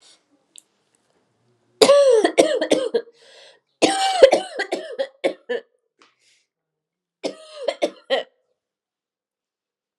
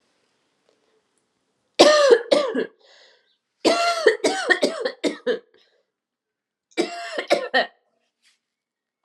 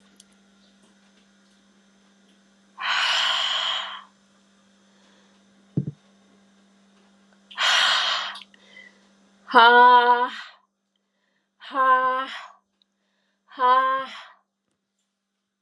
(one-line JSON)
{"cough_length": "10.0 s", "cough_amplitude": 32768, "cough_signal_mean_std_ratio": 0.36, "three_cough_length": "9.0 s", "three_cough_amplitude": 32380, "three_cough_signal_mean_std_ratio": 0.39, "exhalation_length": "15.6 s", "exhalation_amplitude": 28690, "exhalation_signal_mean_std_ratio": 0.37, "survey_phase": "alpha (2021-03-01 to 2021-08-12)", "age": "18-44", "gender": "Female", "wearing_mask": "No", "symptom_cough_any": true, "symptom_new_continuous_cough": true, "symptom_fatigue": true, "symptom_fever_high_temperature": true, "symptom_headache": true, "symptom_change_to_sense_of_smell_or_taste": true, "symptom_onset": "3 days", "smoker_status": "Never smoked", "respiratory_condition_asthma": false, "respiratory_condition_other": false, "recruitment_source": "Test and Trace", "submission_delay": "2 days", "covid_test_result": "Positive", "covid_test_method": "RT-qPCR", "covid_ct_value": 21.8, "covid_ct_gene": "ORF1ab gene", "covid_ct_mean": 22.6, "covid_viral_load": "40000 copies/ml", "covid_viral_load_category": "Low viral load (10K-1M copies/ml)"}